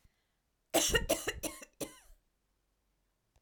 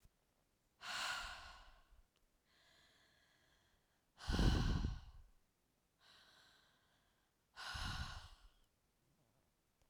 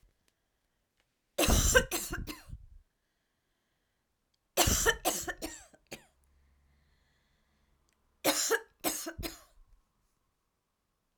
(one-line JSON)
{"cough_length": "3.4 s", "cough_amplitude": 7001, "cough_signal_mean_std_ratio": 0.34, "exhalation_length": "9.9 s", "exhalation_amplitude": 2177, "exhalation_signal_mean_std_ratio": 0.34, "three_cough_length": "11.2 s", "three_cough_amplitude": 12649, "three_cough_signal_mean_std_ratio": 0.33, "survey_phase": "alpha (2021-03-01 to 2021-08-12)", "age": "18-44", "gender": "Female", "wearing_mask": "No", "symptom_none": true, "symptom_onset": "12 days", "smoker_status": "Never smoked", "respiratory_condition_asthma": false, "respiratory_condition_other": false, "recruitment_source": "REACT", "submission_delay": "2 days", "covid_test_result": "Negative", "covid_test_method": "RT-qPCR"}